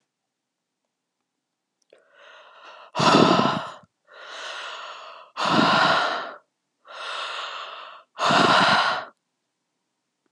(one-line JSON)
{"exhalation_length": "10.3 s", "exhalation_amplitude": 26074, "exhalation_signal_mean_std_ratio": 0.45, "survey_phase": "beta (2021-08-13 to 2022-03-07)", "age": "18-44", "gender": "Female", "wearing_mask": "No", "symptom_cough_any": true, "symptom_runny_or_blocked_nose": true, "symptom_sore_throat": true, "symptom_abdominal_pain": true, "symptom_fatigue": true, "symptom_headache": true, "symptom_onset": "8 days", "smoker_status": "Ex-smoker", "respiratory_condition_asthma": false, "respiratory_condition_other": false, "recruitment_source": "REACT", "submission_delay": "2 days", "covid_test_result": "Negative", "covid_test_method": "RT-qPCR", "influenza_a_test_result": "Unknown/Void", "influenza_b_test_result": "Unknown/Void"}